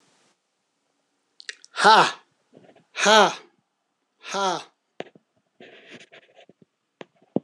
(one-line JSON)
{"exhalation_length": "7.4 s", "exhalation_amplitude": 26028, "exhalation_signal_mean_std_ratio": 0.26, "survey_phase": "beta (2021-08-13 to 2022-03-07)", "age": "45-64", "gender": "Male", "wearing_mask": "No", "symptom_new_continuous_cough": true, "symptom_runny_or_blocked_nose": true, "symptom_sore_throat": true, "symptom_abdominal_pain": true, "symptom_fatigue": true, "symptom_fever_high_temperature": true, "symptom_headache": true, "symptom_change_to_sense_of_smell_or_taste": true, "symptom_other": true, "symptom_onset": "6 days", "smoker_status": "Never smoked", "respiratory_condition_asthma": false, "respiratory_condition_other": false, "recruitment_source": "Test and Trace", "submission_delay": "1 day", "covid_test_result": "Positive", "covid_test_method": "RT-qPCR"}